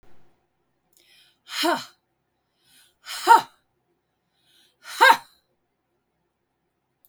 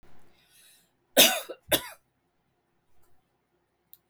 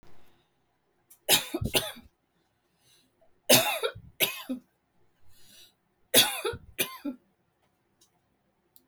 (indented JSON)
{
  "exhalation_length": "7.1 s",
  "exhalation_amplitude": 31460,
  "exhalation_signal_mean_std_ratio": 0.22,
  "cough_length": "4.1 s",
  "cough_amplitude": 22263,
  "cough_signal_mean_std_ratio": 0.23,
  "three_cough_length": "8.9 s",
  "three_cough_amplitude": 21266,
  "three_cough_signal_mean_std_ratio": 0.31,
  "survey_phase": "beta (2021-08-13 to 2022-03-07)",
  "age": "65+",
  "gender": "Female",
  "wearing_mask": "No",
  "symptom_cough_any": true,
  "symptom_shortness_of_breath": true,
  "symptom_fatigue": true,
  "symptom_other": true,
  "symptom_onset": "5 days",
  "smoker_status": "Ex-smoker",
  "respiratory_condition_asthma": true,
  "respiratory_condition_other": false,
  "recruitment_source": "REACT",
  "submission_delay": "8 days",
  "covid_test_result": "Negative",
  "covid_test_method": "RT-qPCR",
  "influenza_a_test_result": "Negative",
  "influenza_b_test_result": "Negative"
}